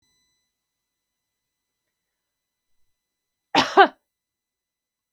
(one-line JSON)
{"cough_length": "5.1 s", "cough_amplitude": 32768, "cough_signal_mean_std_ratio": 0.15, "survey_phase": "beta (2021-08-13 to 2022-03-07)", "age": "45-64", "gender": "Female", "wearing_mask": "No", "symptom_none": true, "smoker_status": "Never smoked", "respiratory_condition_asthma": false, "respiratory_condition_other": false, "recruitment_source": "REACT", "submission_delay": "1 day", "covid_test_result": "Negative", "covid_test_method": "RT-qPCR", "influenza_a_test_result": "Negative", "influenza_b_test_result": "Negative"}